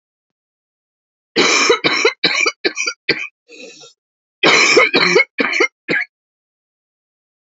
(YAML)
cough_length: 7.6 s
cough_amplitude: 32768
cough_signal_mean_std_ratio: 0.47
survey_phase: alpha (2021-03-01 to 2021-08-12)
age: 45-64
gender: Female
wearing_mask: 'No'
symptom_cough_any: true
symptom_abdominal_pain: true
symptom_fatigue: true
symptom_fever_high_temperature: true
symptom_headache: true
symptom_change_to_sense_of_smell_or_taste: true
symptom_loss_of_taste: true
symptom_onset: 4 days
smoker_status: Ex-smoker
respiratory_condition_asthma: false
respiratory_condition_other: false
recruitment_source: Test and Trace
submission_delay: 1 day
covid_test_result: Positive
covid_test_method: RT-qPCR
covid_ct_value: 14.0
covid_ct_gene: N gene
covid_ct_mean: 14.4
covid_viral_load: 19000000 copies/ml
covid_viral_load_category: High viral load (>1M copies/ml)